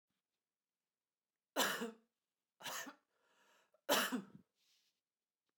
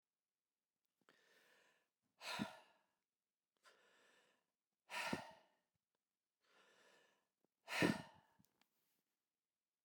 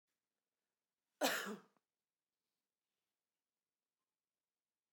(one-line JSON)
{"three_cough_length": "5.6 s", "three_cough_amplitude": 3165, "three_cough_signal_mean_std_ratio": 0.3, "exhalation_length": "9.8 s", "exhalation_amplitude": 1969, "exhalation_signal_mean_std_ratio": 0.23, "cough_length": "4.9 s", "cough_amplitude": 2343, "cough_signal_mean_std_ratio": 0.19, "survey_phase": "beta (2021-08-13 to 2022-03-07)", "age": "45-64", "gender": "Male", "wearing_mask": "No", "symptom_headache": true, "symptom_change_to_sense_of_smell_or_taste": true, "symptom_loss_of_taste": true, "symptom_onset": "2 days", "smoker_status": "Never smoked", "respiratory_condition_asthma": false, "respiratory_condition_other": false, "recruitment_source": "Test and Trace", "submission_delay": "1 day", "covid_test_result": "Positive", "covid_test_method": "RT-qPCR"}